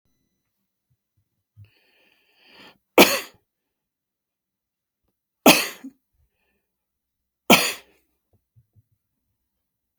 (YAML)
three_cough_length: 10.0 s
three_cough_amplitude: 32767
three_cough_signal_mean_std_ratio: 0.17
survey_phase: beta (2021-08-13 to 2022-03-07)
age: 65+
gender: Male
wearing_mask: 'No'
symptom_none: true
smoker_status: Never smoked
respiratory_condition_asthma: false
respiratory_condition_other: false
recruitment_source: REACT
submission_delay: 2 days
covid_test_result: Negative
covid_test_method: RT-qPCR
influenza_a_test_result: Negative
influenza_b_test_result: Negative